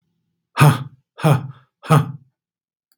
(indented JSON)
{
  "exhalation_length": "3.0 s",
  "exhalation_amplitude": 32767,
  "exhalation_signal_mean_std_ratio": 0.35,
  "survey_phase": "beta (2021-08-13 to 2022-03-07)",
  "age": "45-64",
  "gender": "Male",
  "wearing_mask": "No",
  "symptom_none": true,
  "smoker_status": "Ex-smoker",
  "respiratory_condition_asthma": false,
  "respiratory_condition_other": false,
  "recruitment_source": "REACT",
  "submission_delay": "6 days",
  "covid_test_result": "Negative",
  "covid_test_method": "RT-qPCR",
  "influenza_a_test_result": "Negative",
  "influenza_b_test_result": "Negative"
}